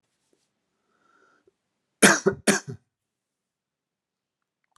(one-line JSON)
{"cough_length": "4.8 s", "cough_amplitude": 28330, "cough_signal_mean_std_ratio": 0.2, "survey_phase": "beta (2021-08-13 to 2022-03-07)", "age": "45-64", "gender": "Male", "wearing_mask": "No", "symptom_cough_any": true, "symptom_abdominal_pain": true, "symptom_fatigue": true, "symptom_fever_high_temperature": true, "symptom_headache": true, "symptom_onset": "3 days", "smoker_status": "Never smoked", "respiratory_condition_asthma": true, "respiratory_condition_other": false, "recruitment_source": "Test and Trace", "submission_delay": "2 days", "covid_test_result": "Positive", "covid_test_method": "RT-qPCR", "covid_ct_value": 16.3, "covid_ct_gene": "ORF1ab gene", "covid_ct_mean": 17.8, "covid_viral_load": "1400000 copies/ml", "covid_viral_load_category": "High viral load (>1M copies/ml)"}